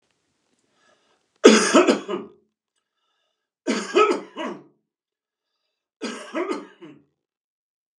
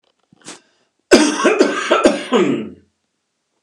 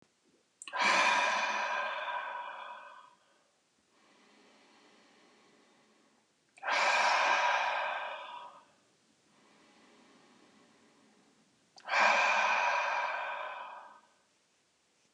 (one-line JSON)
{"three_cough_length": "8.0 s", "three_cough_amplitude": 32768, "three_cough_signal_mean_std_ratio": 0.3, "cough_length": "3.6 s", "cough_amplitude": 32768, "cough_signal_mean_std_ratio": 0.49, "exhalation_length": "15.1 s", "exhalation_amplitude": 6729, "exhalation_signal_mean_std_ratio": 0.5, "survey_phase": "beta (2021-08-13 to 2022-03-07)", "age": "45-64", "gender": "Male", "wearing_mask": "No", "symptom_none": true, "smoker_status": "Never smoked", "respiratory_condition_asthma": false, "respiratory_condition_other": false, "recruitment_source": "REACT", "submission_delay": "1 day", "covid_test_result": "Negative", "covid_test_method": "RT-qPCR", "influenza_a_test_result": "Negative", "influenza_b_test_result": "Negative"}